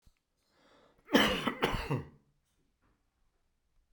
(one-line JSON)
{"cough_length": "3.9 s", "cough_amplitude": 10305, "cough_signal_mean_std_ratio": 0.33, "survey_phase": "beta (2021-08-13 to 2022-03-07)", "age": "65+", "gender": "Male", "wearing_mask": "No", "symptom_cough_any": true, "symptom_runny_or_blocked_nose": true, "symptom_headache": true, "smoker_status": "Ex-smoker", "respiratory_condition_asthma": false, "respiratory_condition_other": false, "recruitment_source": "Test and Trace", "submission_delay": "1 day", "covid_test_result": "Positive", "covid_test_method": "RT-qPCR", "covid_ct_value": 30.3, "covid_ct_gene": "ORF1ab gene", "covid_ct_mean": 31.7, "covid_viral_load": "39 copies/ml", "covid_viral_load_category": "Minimal viral load (< 10K copies/ml)"}